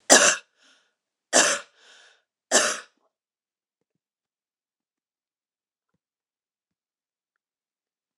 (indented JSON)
{
  "three_cough_length": "8.2 s",
  "three_cough_amplitude": 26028,
  "three_cough_signal_mean_std_ratio": 0.22,
  "survey_phase": "alpha (2021-03-01 to 2021-08-12)",
  "age": "45-64",
  "gender": "Female",
  "wearing_mask": "No",
  "symptom_none": true,
  "smoker_status": "Never smoked",
  "respiratory_condition_asthma": false,
  "respiratory_condition_other": false,
  "recruitment_source": "REACT",
  "submission_delay": "2 days",
  "covid_test_result": "Negative",
  "covid_test_method": "RT-qPCR"
}